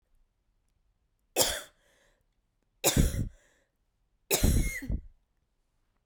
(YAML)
three_cough_length: 6.1 s
three_cough_amplitude: 13799
three_cough_signal_mean_std_ratio: 0.35
survey_phase: beta (2021-08-13 to 2022-03-07)
age: 18-44
gender: Female
wearing_mask: 'No'
symptom_cough_any: true
symptom_runny_or_blocked_nose: true
symptom_sore_throat: true
symptom_fatigue: true
symptom_headache: true
symptom_onset: 2 days
smoker_status: Ex-smoker
respiratory_condition_asthma: true
respiratory_condition_other: false
recruitment_source: Test and Trace
submission_delay: 1 day
covid_test_result: Positive
covid_test_method: RT-qPCR
covid_ct_value: 19.4
covid_ct_gene: ORF1ab gene
covid_ct_mean: 20.1
covid_viral_load: 260000 copies/ml
covid_viral_load_category: Low viral load (10K-1M copies/ml)